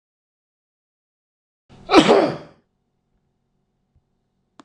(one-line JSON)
{"cough_length": "4.6 s", "cough_amplitude": 26028, "cough_signal_mean_std_ratio": 0.23, "survey_phase": "alpha (2021-03-01 to 2021-08-12)", "age": "45-64", "gender": "Male", "wearing_mask": "No", "symptom_none": true, "smoker_status": "Ex-smoker", "respiratory_condition_asthma": false, "respiratory_condition_other": false, "recruitment_source": "REACT", "submission_delay": "1 day", "covid_test_result": "Negative", "covid_test_method": "RT-qPCR"}